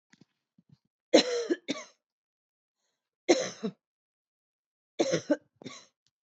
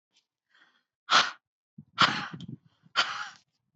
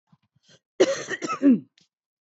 {"three_cough_length": "6.2 s", "three_cough_amplitude": 15636, "three_cough_signal_mean_std_ratio": 0.28, "exhalation_length": "3.8 s", "exhalation_amplitude": 13934, "exhalation_signal_mean_std_ratio": 0.32, "cough_length": "2.4 s", "cough_amplitude": 16949, "cough_signal_mean_std_ratio": 0.35, "survey_phase": "beta (2021-08-13 to 2022-03-07)", "age": "18-44", "gender": "Female", "wearing_mask": "No", "symptom_none": true, "smoker_status": "Current smoker (1 to 10 cigarettes per day)", "respiratory_condition_asthma": false, "respiratory_condition_other": false, "recruitment_source": "REACT", "submission_delay": "1 day", "covid_test_result": "Negative", "covid_test_method": "RT-qPCR"}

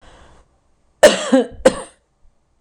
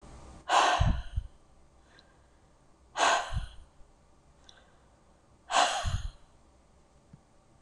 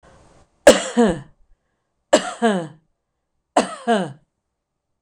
{"cough_length": "2.6 s", "cough_amplitude": 26028, "cough_signal_mean_std_ratio": 0.31, "exhalation_length": "7.6 s", "exhalation_amplitude": 9019, "exhalation_signal_mean_std_ratio": 0.4, "three_cough_length": "5.0 s", "three_cough_amplitude": 26028, "three_cough_signal_mean_std_ratio": 0.34, "survey_phase": "beta (2021-08-13 to 2022-03-07)", "age": "65+", "gender": "Female", "wearing_mask": "No", "symptom_none": true, "smoker_status": "Ex-smoker", "respiratory_condition_asthma": true, "respiratory_condition_other": false, "recruitment_source": "REACT", "submission_delay": "2 days", "covid_test_result": "Negative", "covid_test_method": "RT-qPCR", "influenza_a_test_result": "Negative", "influenza_b_test_result": "Negative"}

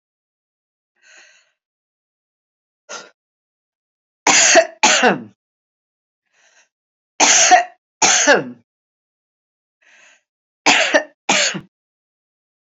{"three_cough_length": "12.6 s", "three_cough_amplitude": 32767, "three_cough_signal_mean_std_ratio": 0.34, "survey_phase": "beta (2021-08-13 to 2022-03-07)", "age": "65+", "gender": "Female", "wearing_mask": "No", "symptom_none": true, "smoker_status": "Never smoked", "respiratory_condition_asthma": false, "respiratory_condition_other": false, "recruitment_source": "REACT", "submission_delay": "2 days", "covid_test_result": "Positive", "covid_test_method": "RT-qPCR", "covid_ct_value": 24.0, "covid_ct_gene": "E gene", "influenza_a_test_result": "Negative", "influenza_b_test_result": "Negative"}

